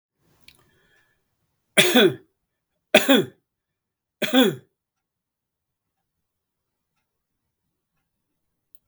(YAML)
three_cough_length: 8.9 s
three_cough_amplitude: 32768
three_cough_signal_mean_std_ratio: 0.24
survey_phase: beta (2021-08-13 to 2022-03-07)
age: 65+
gender: Male
wearing_mask: 'No'
symptom_fatigue: true
smoker_status: Never smoked
respiratory_condition_asthma: false
respiratory_condition_other: false
recruitment_source: REACT
submission_delay: 3 days
covid_test_result: Negative
covid_test_method: RT-qPCR
influenza_a_test_result: Negative
influenza_b_test_result: Negative